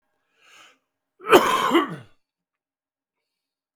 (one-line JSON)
{"cough_length": "3.8 s", "cough_amplitude": 32768, "cough_signal_mean_std_ratio": 0.29, "survey_phase": "beta (2021-08-13 to 2022-03-07)", "age": "45-64", "gender": "Male", "wearing_mask": "No", "symptom_cough_any": true, "symptom_runny_or_blocked_nose": true, "symptom_shortness_of_breath": true, "symptom_diarrhoea": true, "symptom_fatigue": true, "symptom_other": true, "smoker_status": "Ex-smoker", "respiratory_condition_asthma": true, "respiratory_condition_other": false, "recruitment_source": "Test and Trace", "submission_delay": "2 days", "covid_test_result": "Positive", "covid_test_method": "LFT"}